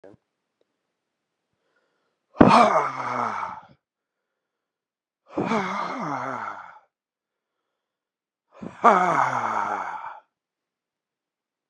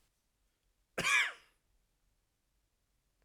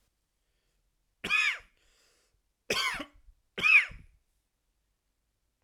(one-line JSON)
{"exhalation_length": "11.7 s", "exhalation_amplitude": 32768, "exhalation_signal_mean_std_ratio": 0.35, "cough_length": "3.2 s", "cough_amplitude": 3808, "cough_signal_mean_std_ratio": 0.26, "three_cough_length": "5.6 s", "three_cough_amplitude": 9506, "three_cough_signal_mean_std_ratio": 0.3, "survey_phase": "alpha (2021-03-01 to 2021-08-12)", "age": "18-44", "gender": "Male", "wearing_mask": "No", "symptom_cough_any": true, "symptom_fever_high_temperature": true, "symptom_headache": true, "symptom_change_to_sense_of_smell_or_taste": true, "symptom_onset": "3 days", "smoker_status": "Never smoked", "respiratory_condition_asthma": false, "respiratory_condition_other": false, "recruitment_source": "Test and Trace", "submission_delay": "1 day", "covid_test_result": "Positive", "covid_test_method": "RT-qPCR"}